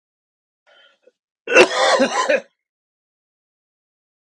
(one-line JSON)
{"cough_length": "4.3 s", "cough_amplitude": 32768, "cough_signal_mean_std_ratio": 0.33, "survey_phase": "beta (2021-08-13 to 2022-03-07)", "age": "45-64", "gender": "Male", "wearing_mask": "No", "symptom_cough_any": true, "symptom_sore_throat": true, "symptom_fatigue": true, "symptom_change_to_sense_of_smell_or_taste": true, "symptom_onset": "7 days", "smoker_status": "Ex-smoker", "respiratory_condition_asthma": false, "respiratory_condition_other": false, "recruitment_source": "Test and Trace", "submission_delay": "1 day", "covid_test_result": "Positive", "covid_test_method": "RT-qPCR", "covid_ct_value": 17.0, "covid_ct_gene": "N gene"}